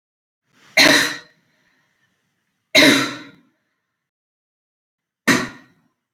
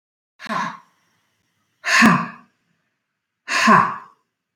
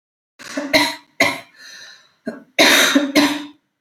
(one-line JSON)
{"three_cough_length": "6.1 s", "three_cough_amplitude": 32768, "three_cough_signal_mean_std_ratio": 0.3, "exhalation_length": "4.6 s", "exhalation_amplitude": 27021, "exhalation_signal_mean_std_ratio": 0.37, "cough_length": "3.8 s", "cough_amplitude": 30067, "cough_signal_mean_std_ratio": 0.49, "survey_phase": "beta (2021-08-13 to 2022-03-07)", "age": "45-64", "gender": "Female", "wearing_mask": "No", "symptom_none": true, "smoker_status": "Ex-smoker", "respiratory_condition_asthma": true, "respiratory_condition_other": false, "recruitment_source": "REACT", "submission_delay": "1 day", "covid_test_result": "Negative", "covid_test_method": "RT-qPCR", "influenza_a_test_result": "Negative", "influenza_b_test_result": "Negative"}